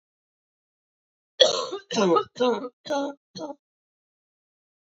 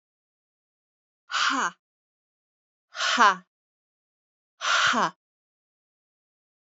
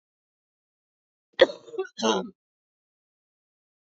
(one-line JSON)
{"three_cough_length": "4.9 s", "three_cough_amplitude": 27292, "three_cough_signal_mean_std_ratio": 0.36, "exhalation_length": "6.7 s", "exhalation_amplitude": 19708, "exhalation_signal_mean_std_ratio": 0.32, "cough_length": "3.8 s", "cough_amplitude": 24090, "cough_signal_mean_std_ratio": 0.21, "survey_phase": "alpha (2021-03-01 to 2021-08-12)", "age": "45-64", "gender": "Female", "wearing_mask": "No", "symptom_cough_any": true, "symptom_fatigue": true, "symptom_headache": true, "symptom_change_to_sense_of_smell_or_taste": true, "symptom_onset": "12 days", "smoker_status": "Never smoked", "respiratory_condition_asthma": false, "respiratory_condition_other": false, "recruitment_source": "REACT", "submission_delay": "1 day", "covid_test_result": "Negative", "covid_test_method": "RT-qPCR"}